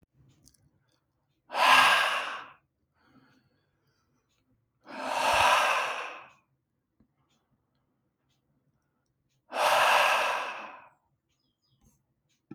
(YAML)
exhalation_length: 12.5 s
exhalation_amplitude: 15716
exhalation_signal_mean_std_ratio: 0.38
survey_phase: beta (2021-08-13 to 2022-03-07)
age: 18-44
gender: Male
wearing_mask: 'No'
symptom_none: true
smoker_status: Never smoked
respiratory_condition_asthma: false
respiratory_condition_other: false
recruitment_source: REACT
submission_delay: 4 days
covid_test_result: Negative
covid_test_method: RT-qPCR
influenza_a_test_result: Negative
influenza_b_test_result: Negative